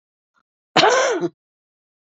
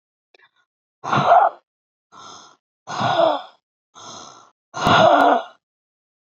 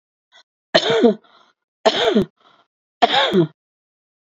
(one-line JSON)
{"cough_length": "2.0 s", "cough_amplitude": 28930, "cough_signal_mean_std_ratio": 0.4, "exhalation_length": "6.2 s", "exhalation_amplitude": 26630, "exhalation_signal_mean_std_ratio": 0.41, "three_cough_length": "4.3 s", "three_cough_amplitude": 32767, "three_cough_signal_mean_std_ratio": 0.42, "survey_phase": "beta (2021-08-13 to 2022-03-07)", "age": "65+", "gender": "Female", "wearing_mask": "No", "symptom_cough_any": true, "symptom_sore_throat": true, "symptom_headache": true, "smoker_status": "Ex-smoker", "respiratory_condition_asthma": false, "respiratory_condition_other": false, "recruitment_source": "Test and Trace", "submission_delay": "1 day", "covid_test_result": "Positive", "covid_test_method": "LFT"}